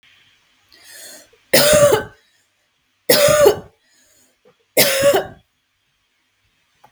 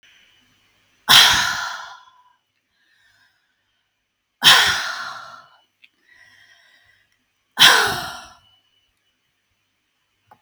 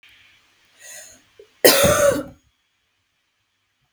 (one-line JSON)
{"three_cough_length": "6.9 s", "three_cough_amplitude": 32768, "three_cough_signal_mean_std_ratio": 0.39, "exhalation_length": "10.4 s", "exhalation_amplitude": 32768, "exhalation_signal_mean_std_ratio": 0.29, "cough_length": "3.9 s", "cough_amplitude": 32768, "cough_signal_mean_std_ratio": 0.31, "survey_phase": "beta (2021-08-13 to 2022-03-07)", "age": "18-44", "gender": "Female", "wearing_mask": "No", "symptom_none": true, "smoker_status": "Ex-smoker", "respiratory_condition_asthma": false, "respiratory_condition_other": false, "recruitment_source": "REACT", "submission_delay": "1 day", "covid_test_result": "Negative", "covid_test_method": "RT-qPCR"}